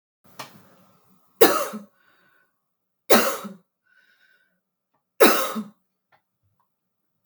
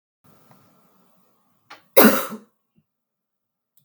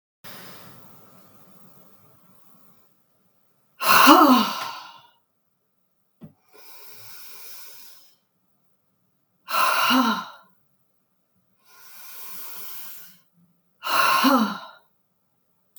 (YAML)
three_cough_length: 7.3 s
three_cough_amplitude: 32768
three_cough_signal_mean_std_ratio: 0.26
cough_length: 3.8 s
cough_amplitude: 32768
cough_signal_mean_std_ratio: 0.21
exhalation_length: 15.8 s
exhalation_amplitude: 32768
exhalation_signal_mean_std_ratio: 0.33
survey_phase: beta (2021-08-13 to 2022-03-07)
age: 45-64
gender: Female
wearing_mask: 'No'
symptom_runny_or_blocked_nose: true
smoker_status: Ex-smoker
respiratory_condition_asthma: true
respiratory_condition_other: false
recruitment_source: Test and Trace
submission_delay: 2 days
covid_test_result: Positive
covid_test_method: LFT